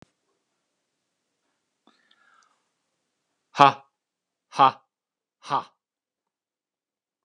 {"exhalation_length": "7.2 s", "exhalation_amplitude": 32767, "exhalation_signal_mean_std_ratio": 0.15, "survey_phase": "alpha (2021-03-01 to 2021-08-12)", "age": "65+", "gender": "Male", "wearing_mask": "No", "symptom_none": true, "smoker_status": "Never smoked", "respiratory_condition_asthma": false, "respiratory_condition_other": false, "recruitment_source": "REACT", "submission_delay": "2 days", "covid_test_result": "Negative", "covid_test_method": "RT-qPCR"}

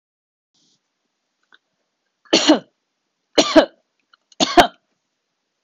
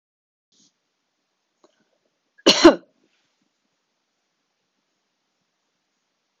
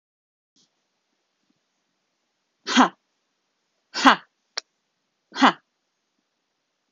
{"three_cough_length": "5.6 s", "three_cough_amplitude": 26028, "three_cough_signal_mean_std_ratio": 0.25, "cough_length": "6.4 s", "cough_amplitude": 26028, "cough_signal_mean_std_ratio": 0.14, "exhalation_length": "6.9 s", "exhalation_amplitude": 26028, "exhalation_signal_mean_std_ratio": 0.19, "survey_phase": "beta (2021-08-13 to 2022-03-07)", "age": "18-44", "gender": "Female", "wearing_mask": "No", "symptom_none": true, "smoker_status": "Never smoked", "respiratory_condition_asthma": false, "respiratory_condition_other": false, "recruitment_source": "REACT", "submission_delay": "3 days", "covid_test_result": "Negative", "covid_test_method": "RT-qPCR"}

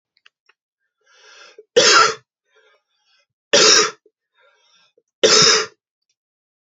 {"three_cough_length": "6.7 s", "three_cough_amplitude": 32768, "three_cough_signal_mean_std_ratio": 0.34, "survey_phase": "beta (2021-08-13 to 2022-03-07)", "age": "18-44", "gender": "Male", "wearing_mask": "No", "symptom_cough_any": true, "smoker_status": "Ex-smoker", "respiratory_condition_asthma": false, "respiratory_condition_other": false, "recruitment_source": "Test and Trace", "submission_delay": "2 days", "covid_test_result": "Positive", "covid_test_method": "LFT"}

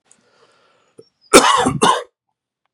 {"cough_length": "2.7 s", "cough_amplitude": 32768, "cough_signal_mean_std_ratio": 0.35, "survey_phase": "beta (2021-08-13 to 2022-03-07)", "age": "45-64", "gender": "Male", "wearing_mask": "No", "symptom_cough_any": true, "symptom_runny_or_blocked_nose": true, "symptom_fever_high_temperature": true, "smoker_status": "Never smoked", "respiratory_condition_asthma": false, "respiratory_condition_other": false, "recruitment_source": "Test and Trace", "submission_delay": "2 days", "covid_test_result": "Positive", "covid_test_method": "RT-qPCR", "covid_ct_value": 30.4, "covid_ct_gene": "N gene"}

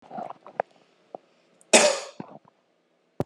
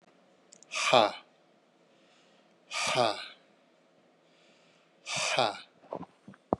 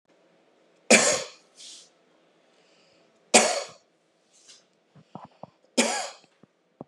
{"cough_length": "3.3 s", "cough_amplitude": 31318, "cough_signal_mean_std_ratio": 0.26, "exhalation_length": "6.6 s", "exhalation_amplitude": 15370, "exhalation_signal_mean_std_ratio": 0.34, "three_cough_length": "6.9 s", "three_cough_amplitude": 29536, "three_cough_signal_mean_std_ratio": 0.27, "survey_phase": "beta (2021-08-13 to 2022-03-07)", "age": "18-44", "gender": "Male", "wearing_mask": "No", "symptom_shortness_of_breath": true, "symptom_fatigue": true, "smoker_status": "Never smoked", "respiratory_condition_asthma": false, "respiratory_condition_other": false, "recruitment_source": "REACT", "submission_delay": "2 days", "covid_test_result": "Negative", "covid_test_method": "RT-qPCR", "influenza_a_test_result": "Negative", "influenza_b_test_result": "Negative"}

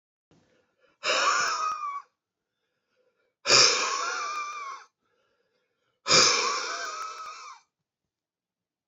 {"exhalation_length": "8.9 s", "exhalation_amplitude": 21140, "exhalation_signal_mean_std_ratio": 0.44, "survey_phase": "beta (2021-08-13 to 2022-03-07)", "age": "45-64", "gender": "Male", "wearing_mask": "No", "symptom_none": true, "smoker_status": "Never smoked", "respiratory_condition_asthma": false, "respiratory_condition_other": false, "recruitment_source": "REACT", "submission_delay": "1 day", "covid_test_result": "Negative", "covid_test_method": "RT-qPCR", "influenza_a_test_result": "Negative", "influenza_b_test_result": "Negative"}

